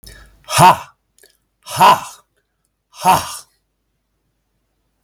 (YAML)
exhalation_length: 5.0 s
exhalation_amplitude: 32768
exhalation_signal_mean_std_ratio: 0.31
survey_phase: beta (2021-08-13 to 2022-03-07)
age: 65+
gender: Male
wearing_mask: 'No'
symptom_change_to_sense_of_smell_or_taste: true
smoker_status: Never smoked
respiratory_condition_asthma: false
respiratory_condition_other: false
recruitment_source: Test and Trace
submission_delay: 1 day
covid_test_result: Positive
covid_test_method: LFT